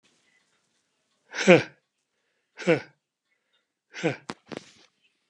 {"exhalation_length": "5.3 s", "exhalation_amplitude": 26354, "exhalation_signal_mean_std_ratio": 0.21, "survey_phase": "beta (2021-08-13 to 2022-03-07)", "age": "65+", "gender": "Male", "wearing_mask": "No", "symptom_none": true, "smoker_status": "Ex-smoker", "respiratory_condition_asthma": false, "respiratory_condition_other": false, "recruitment_source": "REACT", "submission_delay": "2 days", "covid_test_result": "Negative", "covid_test_method": "RT-qPCR", "influenza_a_test_result": "Negative", "influenza_b_test_result": "Negative"}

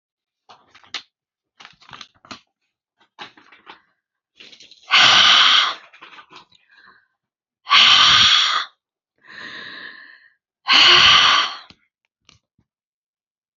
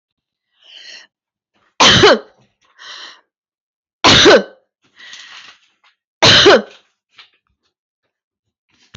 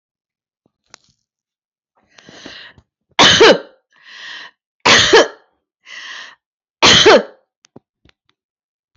{"exhalation_length": "13.6 s", "exhalation_amplitude": 32767, "exhalation_signal_mean_std_ratio": 0.38, "three_cough_length": "9.0 s", "three_cough_amplitude": 32767, "three_cough_signal_mean_std_ratio": 0.32, "cough_length": "9.0 s", "cough_amplitude": 32767, "cough_signal_mean_std_ratio": 0.32, "survey_phase": "beta (2021-08-13 to 2022-03-07)", "age": "45-64", "gender": "Female", "wearing_mask": "No", "symptom_none": true, "smoker_status": "Never smoked", "respiratory_condition_asthma": false, "respiratory_condition_other": false, "recruitment_source": "REACT", "submission_delay": "2 days", "covid_test_result": "Negative", "covid_test_method": "RT-qPCR", "influenza_a_test_result": "Negative", "influenza_b_test_result": "Negative"}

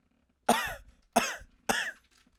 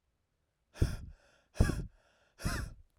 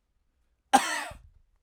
{"three_cough_length": "2.4 s", "three_cough_amplitude": 12587, "three_cough_signal_mean_std_ratio": 0.38, "exhalation_length": "3.0 s", "exhalation_amplitude": 7319, "exhalation_signal_mean_std_ratio": 0.34, "cough_length": "1.6 s", "cough_amplitude": 22143, "cough_signal_mean_std_ratio": 0.28, "survey_phase": "alpha (2021-03-01 to 2021-08-12)", "age": "18-44", "gender": "Male", "wearing_mask": "No", "symptom_diarrhoea": true, "symptom_fatigue": true, "symptom_headache": true, "symptom_onset": "5 days", "smoker_status": "Ex-smoker", "respiratory_condition_asthma": false, "respiratory_condition_other": false, "recruitment_source": "REACT", "submission_delay": "3 days", "covid_test_result": "Negative", "covid_test_method": "RT-qPCR"}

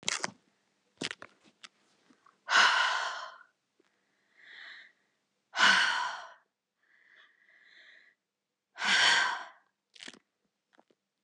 {"exhalation_length": "11.2 s", "exhalation_amplitude": 10595, "exhalation_signal_mean_std_ratio": 0.34, "survey_phase": "beta (2021-08-13 to 2022-03-07)", "age": "18-44", "gender": "Female", "wearing_mask": "No", "symptom_cough_any": true, "symptom_runny_or_blocked_nose": true, "symptom_shortness_of_breath": true, "symptom_sore_throat": true, "symptom_abdominal_pain": true, "symptom_fatigue": true, "symptom_fever_high_temperature": true, "symptom_headache": true, "symptom_change_to_sense_of_smell_or_taste": true, "symptom_other": true, "symptom_onset": "4 days", "smoker_status": "Ex-smoker", "respiratory_condition_asthma": false, "respiratory_condition_other": false, "recruitment_source": "Test and Trace", "submission_delay": "1 day", "covid_test_result": "Positive", "covid_test_method": "RT-qPCR", "covid_ct_value": 17.5, "covid_ct_gene": "N gene"}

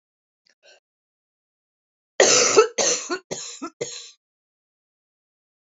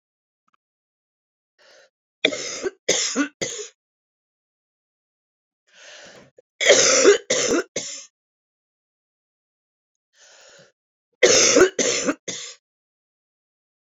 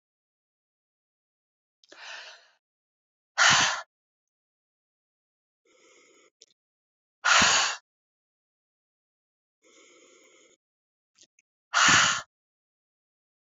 {"cough_length": "5.6 s", "cough_amplitude": 30808, "cough_signal_mean_std_ratio": 0.31, "three_cough_length": "13.8 s", "three_cough_amplitude": 31564, "three_cough_signal_mean_std_ratio": 0.33, "exhalation_length": "13.5 s", "exhalation_amplitude": 15827, "exhalation_signal_mean_std_ratio": 0.26, "survey_phase": "beta (2021-08-13 to 2022-03-07)", "age": "45-64", "gender": "Female", "wearing_mask": "No", "symptom_cough_any": true, "symptom_runny_or_blocked_nose": true, "symptom_fatigue": true, "symptom_onset": "3 days", "smoker_status": "Never smoked", "respiratory_condition_asthma": false, "respiratory_condition_other": false, "recruitment_source": "Test and Trace", "submission_delay": "2 days", "covid_test_result": "Positive", "covid_test_method": "RT-qPCR", "covid_ct_value": 20.8, "covid_ct_gene": "ORF1ab gene", "covid_ct_mean": 21.2, "covid_viral_load": "110000 copies/ml", "covid_viral_load_category": "Low viral load (10K-1M copies/ml)"}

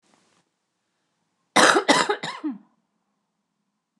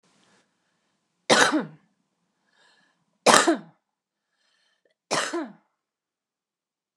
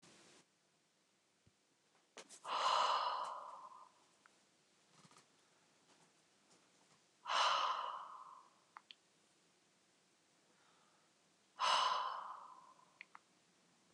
{"cough_length": "4.0 s", "cough_amplitude": 29203, "cough_signal_mean_std_ratio": 0.3, "three_cough_length": "7.0 s", "three_cough_amplitude": 29204, "three_cough_signal_mean_std_ratio": 0.26, "exhalation_length": "13.9 s", "exhalation_amplitude": 2228, "exhalation_signal_mean_std_ratio": 0.37, "survey_phase": "beta (2021-08-13 to 2022-03-07)", "age": "45-64", "gender": "Female", "wearing_mask": "No", "symptom_none": true, "smoker_status": "Current smoker (e-cigarettes or vapes only)", "respiratory_condition_asthma": false, "respiratory_condition_other": false, "recruitment_source": "REACT", "submission_delay": "1 day", "covid_test_result": "Negative", "covid_test_method": "RT-qPCR", "influenza_a_test_result": "Negative", "influenza_b_test_result": "Negative"}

